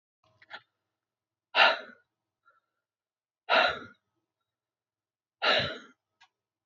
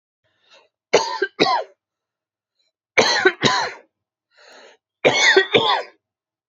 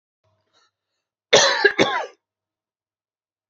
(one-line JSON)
{"exhalation_length": "6.7 s", "exhalation_amplitude": 15160, "exhalation_signal_mean_std_ratio": 0.27, "three_cough_length": "6.5 s", "three_cough_amplitude": 32767, "three_cough_signal_mean_std_ratio": 0.42, "cough_length": "3.5 s", "cough_amplitude": 30112, "cough_signal_mean_std_ratio": 0.31, "survey_phase": "beta (2021-08-13 to 2022-03-07)", "age": "18-44", "gender": "Male", "wearing_mask": "No", "symptom_cough_any": true, "smoker_status": "Never smoked", "respiratory_condition_asthma": false, "respiratory_condition_other": false, "recruitment_source": "REACT", "submission_delay": "8 days", "covid_test_result": "Negative", "covid_test_method": "RT-qPCR"}